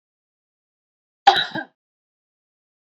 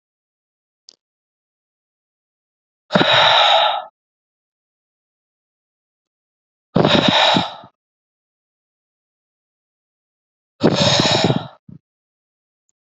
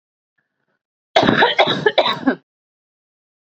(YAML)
cough_length: 2.9 s
cough_amplitude: 28074
cough_signal_mean_std_ratio: 0.19
exhalation_length: 12.9 s
exhalation_amplitude: 30481
exhalation_signal_mean_std_ratio: 0.35
three_cough_length: 3.5 s
three_cough_amplitude: 32768
three_cough_signal_mean_std_ratio: 0.4
survey_phase: beta (2021-08-13 to 2022-03-07)
age: 18-44
gender: Female
wearing_mask: 'No'
symptom_new_continuous_cough: true
symptom_sore_throat: true
symptom_other: true
smoker_status: Current smoker (11 or more cigarettes per day)
respiratory_condition_asthma: false
respiratory_condition_other: false
recruitment_source: Test and Trace
submission_delay: -1 day
covid_test_result: Positive
covid_test_method: LFT